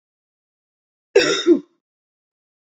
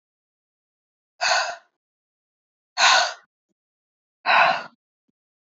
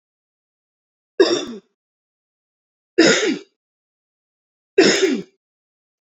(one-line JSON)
{"cough_length": "2.7 s", "cough_amplitude": 26754, "cough_signal_mean_std_ratio": 0.28, "exhalation_length": "5.5 s", "exhalation_amplitude": 22762, "exhalation_signal_mean_std_ratio": 0.33, "three_cough_length": "6.1 s", "three_cough_amplitude": 27991, "three_cough_signal_mean_std_ratio": 0.32, "survey_phase": "beta (2021-08-13 to 2022-03-07)", "age": "18-44", "gender": "Female", "wearing_mask": "No", "symptom_none": true, "smoker_status": "Never smoked", "respiratory_condition_asthma": false, "respiratory_condition_other": false, "recruitment_source": "REACT", "submission_delay": "1 day", "covid_test_result": "Negative", "covid_test_method": "RT-qPCR"}